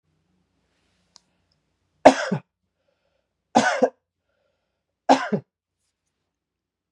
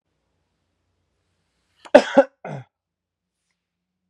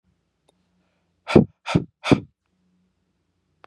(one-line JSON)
{"three_cough_length": "6.9 s", "three_cough_amplitude": 32768, "three_cough_signal_mean_std_ratio": 0.21, "cough_length": "4.1 s", "cough_amplitude": 32768, "cough_signal_mean_std_ratio": 0.16, "exhalation_length": "3.7 s", "exhalation_amplitude": 32386, "exhalation_signal_mean_std_ratio": 0.21, "survey_phase": "beta (2021-08-13 to 2022-03-07)", "age": "18-44", "gender": "Male", "wearing_mask": "No", "symptom_cough_any": true, "symptom_runny_or_blocked_nose": true, "symptom_shortness_of_breath": true, "symptom_sore_throat": true, "symptom_fatigue": true, "symptom_headache": true, "smoker_status": "Never smoked", "respiratory_condition_asthma": true, "respiratory_condition_other": false, "recruitment_source": "Test and Trace", "submission_delay": "1 day", "covid_test_result": "Positive", "covid_test_method": "RT-qPCR"}